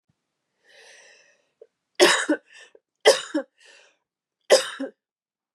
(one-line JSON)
{"three_cough_length": "5.5 s", "three_cough_amplitude": 28150, "three_cough_signal_mean_std_ratio": 0.27, "survey_phase": "beta (2021-08-13 to 2022-03-07)", "age": "18-44", "gender": "Female", "wearing_mask": "No", "symptom_cough_any": true, "symptom_new_continuous_cough": true, "symptom_runny_or_blocked_nose": true, "symptom_fatigue": true, "symptom_loss_of_taste": true, "symptom_onset": "5 days", "smoker_status": "Ex-smoker", "respiratory_condition_asthma": false, "respiratory_condition_other": false, "recruitment_source": "Test and Trace", "submission_delay": "1 day", "covid_test_result": "Positive", "covid_test_method": "ePCR"}